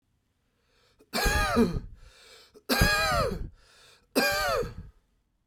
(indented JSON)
{
  "three_cough_length": "5.5 s",
  "three_cough_amplitude": 13468,
  "three_cough_signal_mean_std_ratio": 0.53,
  "survey_phase": "beta (2021-08-13 to 2022-03-07)",
  "age": "18-44",
  "gender": "Male",
  "wearing_mask": "No",
  "symptom_runny_or_blocked_nose": true,
  "symptom_change_to_sense_of_smell_or_taste": true,
  "symptom_onset": "2 days",
  "smoker_status": "Ex-smoker",
  "respiratory_condition_asthma": false,
  "respiratory_condition_other": false,
  "recruitment_source": "Test and Trace",
  "submission_delay": "1 day",
  "covid_test_result": "Positive",
  "covid_test_method": "RT-qPCR",
  "covid_ct_value": 23.4,
  "covid_ct_gene": "ORF1ab gene"
}